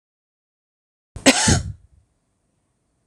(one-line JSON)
{"cough_length": "3.1 s", "cough_amplitude": 26028, "cough_signal_mean_std_ratio": 0.27, "survey_phase": "alpha (2021-03-01 to 2021-08-12)", "age": "45-64", "gender": "Female", "wearing_mask": "No", "symptom_none": true, "smoker_status": "Ex-smoker", "respiratory_condition_asthma": false, "respiratory_condition_other": false, "recruitment_source": "REACT", "submission_delay": "1 day", "covid_test_result": "Negative", "covid_test_method": "RT-qPCR"}